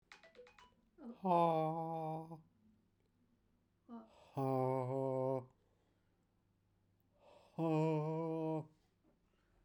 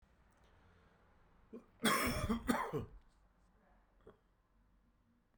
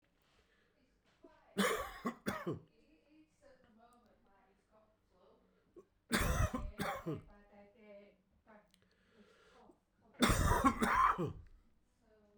{"exhalation_length": "9.6 s", "exhalation_amplitude": 2673, "exhalation_signal_mean_std_ratio": 0.49, "cough_length": "5.4 s", "cough_amplitude": 3500, "cough_signal_mean_std_ratio": 0.37, "three_cough_length": "12.4 s", "three_cough_amplitude": 5449, "three_cough_signal_mean_std_ratio": 0.38, "survey_phase": "beta (2021-08-13 to 2022-03-07)", "age": "45-64", "gender": "Male", "wearing_mask": "No", "symptom_cough_any": true, "symptom_runny_or_blocked_nose": true, "symptom_shortness_of_breath": true, "symptom_fatigue": true, "symptom_fever_high_temperature": true, "symptom_headache": true, "symptom_change_to_sense_of_smell_or_taste": true, "symptom_onset": "2 days", "smoker_status": "Never smoked", "respiratory_condition_asthma": false, "respiratory_condition_other": false, "recruitment_source": "Test and Trace", "submission_delay": "1 day", "covid_test_result": "Positive", "covid_test_method": "RT-qPCR"}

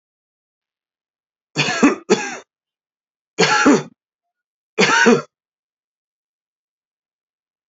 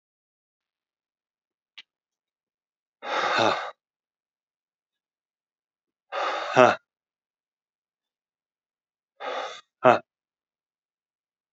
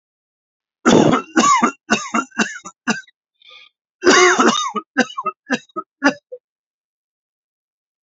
{"three_cough_length": "7.7 s", "three_cough_amplitude": 30212, "three_cough_signal_mean_std_ratio": 0.33, "exhalation_length": "11.5 s", "exhalation_amplitude": 27589, "exhalation_signal_mean_std_ratio": 0.23, "cough_length": "8.0 s", "cough_amplitude": 32767, "cough_signal_mean_std_ratio": 0.42, "survey_phase": "alpha (2021-03-01 to 2021-08-12)", "age": "45-64", "gender": "Male", "wearing_mask": "No", "symptom_cough_any": true, "symptom_shortness_of_breath": true, "symptom_fatigue": true, "symptom_fever_high_temperature": true, "symptom_change_to_sense_of_smell_or_taste": true, "symptom_loss_of_taste": true, "symptom_onset": "2 days", "smoker_status": "Never smoked", "respiratory_condition_asthma": false, "respiratory_condition_other": false, "recruitment_source": "Test and Trace", "submission_delay": "2 days", "covid_test_result": "Positive", "covid_test_method": "RT-qPCR", "covid_ct_value": 14.6, "covid_ct_gene": "S gene", "covid_ct_mean": 14.9, "covid_viral_load": "13000000 copies/ml", "covid_viral_load_category": "High viral load (>1M copies/ml)"}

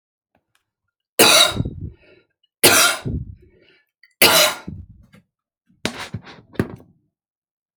{"three_cough_length": "7.8 s", "three_cough_amplitude": 32768, "three_cough_signal_mean_std_ratio": 0.34, "survey_phase": "alpha (2021-03-01 to 2021-08-12)", "age": "18-44", "gender": "Male", "wearing_mask": "No", "symptom_cough_any": true, "symptom_onset": "10 days", "smoker_status": "Never smoked", "respiratory_condition_asthma": false, "respiratory_condition_other": false, "recruitment_source": "REACT", "submission_delay": "1 day", "covid_test_result": "Negative", "covid_test_method": "RT-qPCR"}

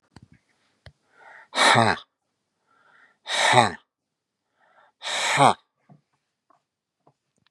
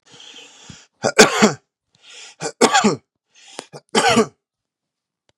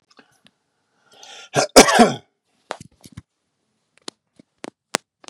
{"exhalation_length": "7.5 s", "exhalation_amplitude": 32344, "exhalation_signal_mean_std_ratio": 0.3, "three_cough_length": "5.4 s", "three_cough_amplitude": 32768, "three_cough_signal_mean_std_ratio": 0.34, "cough_length": "5.3 s", "cough_amplitude": 32768, "cough_signal_mean_std_ratio": 0.22, "survey_phase": "beta (2021-08-13 to 2022-03-07)", "age": "45-64", "gender": "Male", "wearing_mask": "No", "symptom_fatigue": true, "symptom_headache": true, "smoker_status": "Never smoked", "respiratory_condition_asthma": false, "respiratory_condition_other": false, "recruitment_source": "Test and Trace", "submission_delay": "2 days", "covid_test_result": "Positive", "covid_test_method": "RT-qPCR", "covid_ct_value": 35.9, "covid_ct_gene": "ORF1ab gene"}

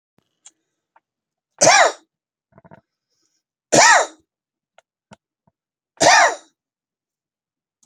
{"three_cough_length": "7.9 s", "three_cough_amplitude": 32768, "three_cough_signal_mean_std_ratio": 0.28, "survey_phase": "beta (2021-08-13 to 2022-03-07)", "age": "65+", "gender": "Male", "wearing_mask": "No", "symptom_none": true, "smoker_status": "Ex-smoker", "respiratory_condition_asthma": false, "respiratory_condition_other": true, "recruitment_source": "Test and Trace", "submission_delay": "1 day", "covid_test_result": "Negative", "covid_test_method": "ePCR"}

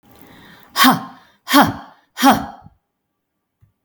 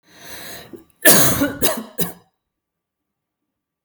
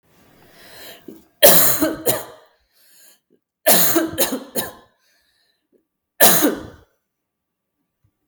{"exhalation_length": "3.8 s", "exhalation_amplitude": 32768, "exhalation_signal_mean_std_ratio": 0.35, "cough_length": "3.8 s", "cough_amplitude": 32768, "cough_signal_mean_std_ratio": 0.36, "three_cough_length": "8.3 s", "three_cough_amplitude": 32768, "three_cough_signal_mean_std_ratio": 0.36, "survey_phase": "beta (2021-08-13 to 2022-03-07)", "age": "45-64", "gender": "Female", "wearing_mask": "No", "symptom_none": true, "smoker_status": "Never smoked", "respiratory_condition_asthma": false, "respiratory_condition_other": false, "recruitment_source": "REACT", "submission_delay": "1 day", "covid_test_result": "Negative", "covid_test_method": "RT-qPCR", "influenza_a_test_result": "Negative", "influenza_b_test_result": "Negative"}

